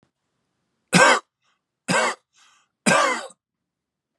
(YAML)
three_cough_length: 4.2 s
three_cough_amplitude: 30095
three_cough_signal_mean_std_ratio: 0.35
survey_phase: beta (2021-08-13 to 2022-03-07)
age: 18-44
gender: Male
wearing_mask: 'No'
symptom_cough_any: true
symptom_runny_or_blocked_nose: true
symptom_onset: 13 days
smoker_status: Never smoked
respiratory_condition_asthma: false
respiratory_condition_other: false
recruitment_source: REACT
submission_delay: 0 days
covid_test_result: Negative
covid_test_method: RT-qPCR